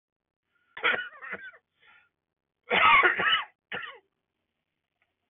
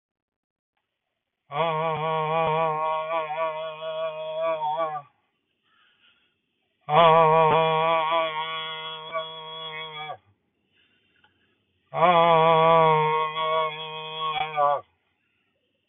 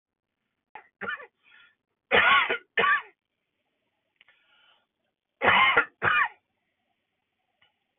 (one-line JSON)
{"cough_length": "5.3 s", "cough_amplitude": 12417, "cough_signal_mean_std_ratio": 0.35, "exhalation_length": "15.9 s", "exhalation_amplitude": 18686, "exhalation_signal_mean_std_ratio": 0.55, "three_cough_length": "8.0 s", "three_cough_amplitude": 14548, "three_cough_signal_mean_std_ratio": 0.34, "survey_phase": "beta (2021-08-13 to 2022-03-07)", "age": "18-44", "gender": "Male", "wearing_mask": "No", "symptom_cough_any": true, "symptom_sore_throat": true, "symptom_onset": "11 days", "smoker_status": "Ex-smoker", "respiratory_condition_asthma": false, "respiratory_condition_other": false, "recruitment_source": "REACT", "submission_delay": "2 days", "covid_test_result": "Negative", "covid_test_method": "RT-qPCR", "influenza_a_test_result": "Negative", "influenza_b_test_result": "Negative"}